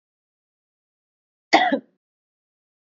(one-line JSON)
{"cough_length": "3.0 s", "cough_amplitude": 27580, "cough_signal_mean_std_ratio": 0.21, "survey_phase": "beta (2021-08-13 to 2022-03-07)", "age": "18-44", "gender": "Female", "wearing_mask": "No", "symptom_none": true, "symptom_onset": "9 days", "smoker_status": "Ex-smoker", "respiratory_condition_asthma": true, "respiratory_condition_other": false, "recruitment_source": "REACT", "submission_delay": "1 day", "covid_test_result": "Negative", "covid_test_method": "RT-qPCR", "influenza_a_test_result": "Negative", "influenza_b_test_result": "Negative"}